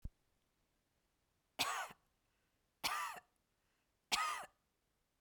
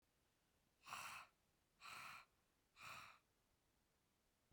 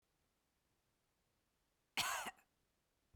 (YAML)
three_cough_length: 5.2 s
three_cough_amplitude: 2577
three_cough_signal_mean_std_ratio: 0.34
exhalation_length: 4.5 s
exhalation_amplitude: 425
exhalation_signal_mean_std_ratio: 0.47
cough_length: 3.2 s
cough_amplitude: 1827
cough_signal_mean_std_ratio: 0.26
survey_phase: beta (2021-08-13 to 2022-03-07)
age: 65+
gender: Female
wearing_mask: 'No'
symptom_none: true
smoker_status: Never smoked
respiratory_condition_asthma: false
respiratory_condition_other: false
recruitment_source: REACT
submission_delay: 1 day
covid_test_result: Negative
covid_test_method: RT-qPCR